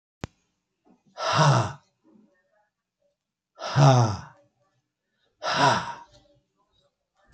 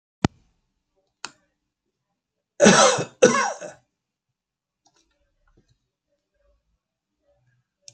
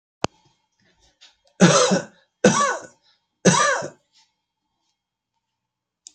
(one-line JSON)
{"exhalation_length": "7.3 s", "exhalation_amplitude": 21785, "exhalation_signal_mean_std_ratio": 0.35, "cough_length": "7.9 s", "cough_amplitude": 28124, "cough_signal_mean_std_ratio": 0.23, "three_cough_length": "6.1 s", "three_cough_amplitude": 28201, "three_cough_signal_mean_std_ratio": 0.33, "survey_phase": "beta (2021-08-13 to 2022-03-07)", "age": "65+", "gender": "Male", "wearing_mask": "No", "symptom_shortness_of_breath": true, "symptom_fatigue": true, "symptom_headache": true, "smoker_status": "Ex-smoker", "respiratory_condition_asthma": false, "respiratory_condition_other": false, "recruitment_source": "REACT", "submission_delay": "1 day", "covid_test_result": "Negative", "covid_test_method": "RT-qPCR"}